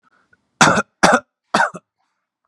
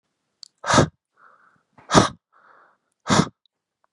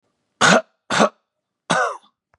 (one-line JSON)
{"cough_length": "2.5 s", "cough_amplitude": 32768, "cough_signal_mean_std_ratio": 0.36, "exhalation_length": "3.9 s", "exhalation_amplitude": 31651, "exhalation_signal_mean_std_ratio": 0.28, "three_cough_length": "2.4 s", "three_cough_amplitude": 30902, "three_cough_signal_mean_std_ratio": 0.39, "survey_phase": "beta (2021-08-13 to 2022-03-07)", "age": "18-44", "gender": "Male", "wearing_mask": "No", "symptom_none": true, "smoker_status": "Never smoked", "respiratory_condition_asthma": false, "respiratory_condition_other": false, "recruitment_source": "REACT", "submission_delay": "2 days", "covid_test_result": "Negative", "covid_test_method": "RT-qPCR", "influenza_a_test_result": "Negative", "influenza_b_test_result": "Negative"}